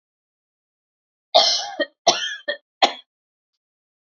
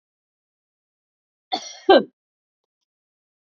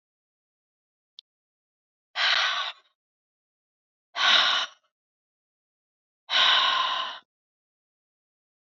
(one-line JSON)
{"three_cough_length": "4.1 s", "three_cough_amplitude": 28892, "three_cough_signal_mean_std_ratio": 0.31, "cough_length": "3.4 s", "cough_amplitude": 27989, "cough_signal_mean_std_ratio": 0.18, "exhalation_length": "8.7 s", "exhalation_amplitude": 16767, "exhalation_signal_mean_std_ratio": 0.36, "survey_phase": "beta (2021-08-13 to 2022-03-07)", "age": "45-64", "gender": "Female", "wearing_mask": "No", "symptom_none": true, "smoker_status": "Never smoked", "respiratory_condition_asthma": false, "respiratory_condition_other": false, "recruitment_source": "REACT", "submission_delay": "2 days", "covid_test_result": "Negative", "covid_test_method": "RT-qPCR", "influenza_a_test_result": "Negative", "influenza_b_test_result": "Negative"}